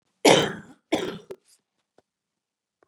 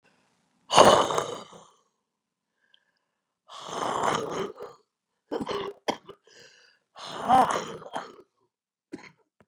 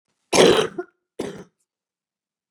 {"cough_length": "2.9 s", "cough_amplitude": 25275, "cough_signal_mean_std_ratio": 0.28, "exhalation_length": "9.5 s", "exhalation_amplitude": 30044, "exhalation_signal_mean_std_ratio": 0.32, "three_cough_length": "2.5 s", "three_cough_amplitude": 32097, "three_cough_signal_mean_std_ratio": 0.31, "survey_phase": "beta (2021-08-13 to 2022-03-07)", "age": "65+", "gender": "Female", "wearing_mask": "No", "symptom_cough_any": true, "symptom_shortness_of_breath": true, "symptom_diarrhoea": true, "symptom_fatigue": true, "symptom_onset": "12 days", "smoker_status": "Ex-smoker", "respiratory_condition_asthma": true, "respiratory_condition_other": true, "recruitment_source": "REACT", "submission_delay": "3 days", "covid_test_result": "Negative", "covid_test_method": "RT-qPCR", "influenza_a_test_result": "Negative", "influenza_b_test_result": "Negative"}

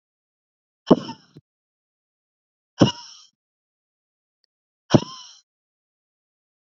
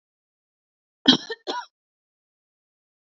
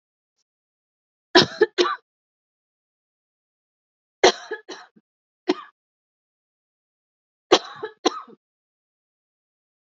{"exhalation_length": "6.7 s", "exhalation_amplitude": 32767, "exhalation_signal_mean_std_ratio": 0.15, "cough_length": "3.1 s", "cough_amplitude": 32768, "cough_signal_mean_std_ratio": 0.19, "three_cough_length": "9.9 s", "three_cough_amplitude": 30732, "three_cough_signal_mean_std_ratio": 0.2, "survey_phase": "beta (2021-08-13 to 2022-03-07)", "age": "45-64", "gender": "Female", "wearing_mask": "No", "symptom_cough_any": true, "symptom_runny_or_blocked_nose": true, "symptom_shortness_of_breath": true, "symptom_fatigue": true, "symptom_onset": "4 days", "smoker_status": "Never smoked", "respiratory_condition_asthma": false, "respiratory_condition_other": false, "recruitment_source": "Test and Trace", "submission_delay": "1 day", "covid_test_result": "Positive", "covid_test_method": "RT-qPCR", "covid_ct_value": 23.2, "covid_ct_gene": "N gene"}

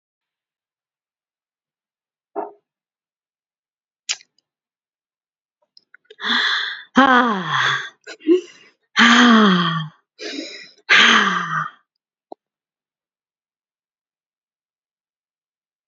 {"exhalation_length": "15.9 s", "exhalation_amplitude": 30628, "exhalation_signal_mean_std_ratio": 0.35, "survey_phase": "beta (2021-08-13 to 2022-03-07)", "age": "65+", "gender": "Female", "wearing_mask": "No", "symptom_none": true, "smoker_status": "Ex-smoker", "respiratory_condition_asthma": false, "respiratory_condition_other": false, "recruitment_source": "REACT", "submission_delay": "1 day", "covid_test_result": "Negative", "covid_test_method": "RT-qPCR", "influenza_a_test_result": "Negative", "influenza_b_test_result": "Negative"}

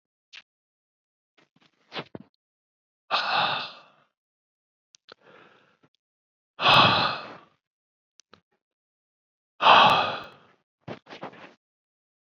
{"exhalation_length": "12.2 s", "exhalation_amplitude": 25207, "exhalation_signal_mean_std_ratio": 0.28, "survey_phase": "beta (2021-08-13 to 2022-03-07)", "age": "65+", "gender": "Male", "wearing_mask": "No", "symptom_abdominal_pain": true, "symptom_onset": "10 days", "smoker_status": "Never smoked", "respiratory_condition_asthma": false, "respiratory_condition_other": false, "recruitment_source": "REACT", "submission_delay": "2 days", "covid_test_result": "Negative", "covid_test_method": "RT-qPCR", "influenza_a_test_result": "Negative", "influenza_b_test_result": "Negative"}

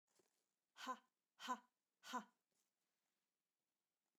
{"exhalation_length": "4.2 s", "exhalation_amplitude": 771, "exhalation_signal_mean_std_ratio": 0.26, "survey_phase": "beta (2021-08-13 to 2022-03-07)", "age": "45-64", "gender": "Female", "wearing_mask": "No", "symptom_none": true, "smoker_status": "Never smoked", "respiratory_condition_asthma": false, "respiratory_condition_other": false, "recruitment_source": "REACT", "submission_delay": "2 days", "covid_test_result": "Negative", "covid_test_method": "RT-qPCR"}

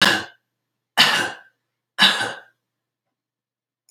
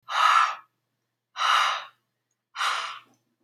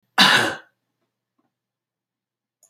{"three_cough_length": "3.9 s", "three_cough_amplitude": 29721, "three_cough_signal_mean_std_ratio": 0.35, "exhalation_length": "3.4 s", "exhalation_amplitude": 12656, "exhalation_signal_mean_std_ratio": 0.48, "cough_length": "2.7 s", "cough_amplitude": 31165, "cough_signal_mean_std_ratio": 0.28, "survey_phase": "alpha (2021-03-01 to 2021-08-12)", "age": "18-44", "gender": "Male", "wearing_mask": "No", "symptom_none": true, "smoker_status": "Current smoker (1 to 10 cigarettes per day)", "respiratory_condition_asthma": false, "respiratory_condition_other": false, "recruitment_source": "REACT", "submission_delay": "21 days", "covid_test_result": "Negative", "covid_test_method": "RT-qPCR"}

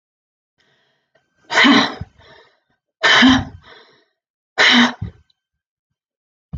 {"exhalation_length": "6.6 s", "exhalation_amplitude": 30357, "exhalation_signal_mean_std_ratio": 0.36, "survey_phase": "alpha (2021-03-01 to 2021-08-12)", "age": "45-64", "gender": "Female", "wearing_mask": "No", "symptom_none": true, "symptom_onset": "3 days", "smoker_status": "Never smoked", "respiratory_condition_asthma": false, "respiratory_condition_other": false, "recruitment_source": "REACT", "submission_delay": "3 days", "covid_test_result": "Negative", "covid_test_method": "RT-qPCR"}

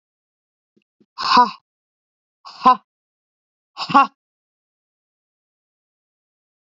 {"exhalation_length": "6.7 s", "exhalation_amplitude": 27391, "exhalation_signal_mean_std_ratio": 0.22, "survey_phase": "beta (2021-08-13 to 2022-03-07)", "age": "45-64", "gender": "Female", "wearing_mask": "No", "symptom_none": true, "smoker_status": "Never smoked", "respiratory_condition_asthma": false, "respiratory_condition_other": false, "recruitment_source": "REACT", "submission_delay": "3 days", "covid_test_result": "Negative", "covid_test_method": "RT-qPCR", "influenza_a_test_result": "Negative", "influenza_b_test_result": "Negative"}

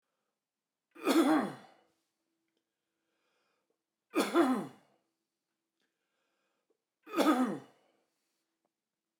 {"three_cough_length": "9.2 s", "three_cough_amplitude": 5883, "three_cough_signal_mean_std_ratio": 0.31, "survey_phase": "beta (2021-08-13 to 2022-03-07)", "age": "65+", "gender": "Male", "wearing_mask": "No", "symptom_runny_or_blocked_nose": true, "smoker_status": "Never smoked", "respiratory_condition_asthma": false, "respiratory_condition_other": false, "recruitment_source": "REACT", "submission_delay": "1 day", "covid_test_result": "Negative", "covid_test_method": "RT-qPCR"}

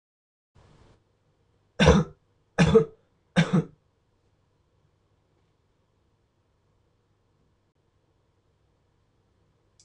{"three_cough_length": "9.8 s", "three_cough_amplitude": 20605, "three_cough_signal_mean_std_ratio": 0.22, "survey_phase": "beta (2021-08-13 to 2022-03-07)", "age": "18-44", "gender": "Male", "wearing_mask": "No", "symptom_new_continuous_cough": true, "symptom_runny_or_blocked_nose": true, "symptom_sore_throat": true, "symptom_diarrhoea": true, "symptom_fatigue": true, "symptom_headache": true, "symptom_onset": "2 days", "smoker_status": "Never smoked", "respiratory_condition_asthma": false, "respiratory_condition_other": false, "recruitment_source": "Test and Trace", "submission_delay": "1 day", "covid_test_result": "Positive", "covid_test_method": "RT-qPCR", "covid_ct_value": 23.5, "covid_ct_gene": "N gene"}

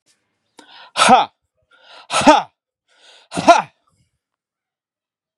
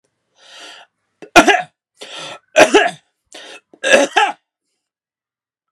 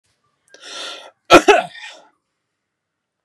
{"exhalation_length": "5.4 s", "exhalation_amplitude": 32768, "exhalation_signal_mean_std_ratio": 0.29, "three_cough_length": "5.7 s", "three_cough_amplitude": 32768, "three_cough_signal_mean_std_ratio": 0.33, "cough_length": "3.2 s", "cough_amplitude": 32768, "cough_signal_mean_std_ratio": 0.25, "survey_phase": "beta (2021-08-13 to 2022-03-07)", "age": "45-64", "gender": "Male", "wearing_mask": "No", "symptom_none": true, "smoker_status": "Never smoked", "respiratory_condition_asthma": false, "respiratory_condition_other": false, "recruitment_source": "REACT", "submission_delay": "2 days", "covid_test_result": "Negative", "covid_test_method": "RT-qPCR", "influenza_a_test_result": "Negative", "influenza_b_test_result": "Negative"}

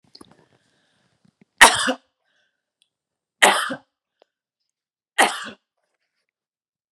{"three_cough_length": "6.9 s", "three_cough_amplitude": 32768, "three_cough_signal_mean_std_ratio": 0.22, "survey_phase": "beta (2021-08-13 to 2022-03-07)", "age": "45-64", "gender": "Female", "wearing_mask": "No", "symptom_none": true, "smoker_status": "Never smoked", "respiratory_condition_asthma": false, "respiratory_condition_other": false, "recruitment_source": "REACT", "submission_delay": "3 days", "covid_test_result": "Negative", "covid_test_method": "RT-qPCR", "influenza_a_test_result": "Negative", "influenza_b_test_result": "Negative"}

